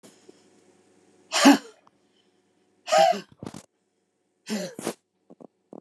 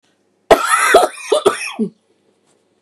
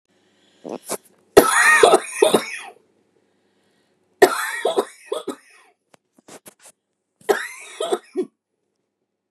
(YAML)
exhalation_length: 5.8 s
exhalation_amplitude: 20021
exhalation_signal_mean_std_ratio: 0.27
cough_length: 2.8 s
cough_amplitude: 32768
cough_signal_mean_std_ratio: 0.45
three_cough_length: 9.3 s
three_cough_amplitude: 32768
three_cough_signal_mean_std_ratio: 0.33
survey_phase: beta (2021-08-13 to 2022-03-07)
age: 45-64
gender: Female
wearing_mask: 'No'
symptom_cough_any: true
symptom_shortness_of_breath: true
symptom_sore_throat: true
symptom_diarrhoea: true
symptom_fatigue: true
symptom_onset: 12 days
smoker_status: Ex-smoker
respiratory_condition_asthma: true
respiratory_condition_other: false
recruitment_source: REACT
submission_delay: 1 day
covid_test_result: Negative
covid_test_method: RT-qPCR
covid_ct_value: 37.2
covid_ct_gene: N gene
influenza_a_test_result: Negative
influenza_b_test_result: Negative